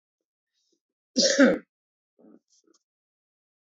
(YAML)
cough_length: 3.8 s
cough_amplitude: 19855
cough_signal_mean_std_ratio: 0.25
survey_phase: beta (2021-08-13 to 2022-03-07)
age: 45-64
gender: Male
wearing_mask: 'No'
symptom_cough_any: true
symptom_sore_throat: true
smoker_status: Ex-smoker
respiratory_condition_asthma: false
respiratory_condition_other: false
recruitment_source: REACT
submission_delay: 1 day
covid_test_result: Negative
covid_test_method: RT-qPCR
influenza_a_test_result: Negative
influenza_b_test_result: Negative